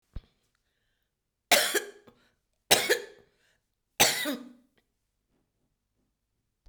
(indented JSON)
{
  "three_cough_length": "6.7 s",
  "three_cough_amplitude": 21481,
  "three_cough_signal_mean_std_ratio": 0.27,
  "survey_phase": "beta (2021-08-13 to 2022-03-07)",
  "age": "65+",
  "gender": "Female",
  "wearing_mask": "No",
  "symptom_cough_any": true,
  "smoker_status": "Never smoked",
  "respiratory_condition_asthma": false,
  "respiratory_condition_other": false,
  "recruitment_source": "REACT",
  "submission_delay": "1 day",
  "covid_test_result": "Negative",
  "covid_test_method": "RT-qPCR",
  "influenza_a_test_result": "Negative",
  "influenza_b_test_result": "Negative"
}